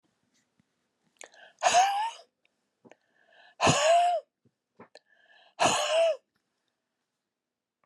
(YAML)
exhalation_length: 7.9 s
exhalation_amplitude: 12188
exhalation_signal_mean_std_ratio: 0.39
survey_phase: beta (2021-08-13 to 2022-03-07)
age: 65+
gender: Female
wearing_mask: 'No'
symptom_cough_any: true
symptom_sore_throat: true
symptom_change_to_sense_of_smell_or_taste: true
symptom_onset: 7 days
smoker_status: Never smoked
respiratory_condition_asthma: false
respiratory_condition_other: false
recruitment_source: Test and Trace
submission_delay: 2 days
covid_test_result: Positive
covid_test_method: RT-qPCR
covid_ct_value: 17.8
covid_ct_gene: N gene
covid_ct_mean: 17.9
covid_viral_load: 1300000 copies/ml
covid_viral_load_category: High viral load (>1M copies/ml)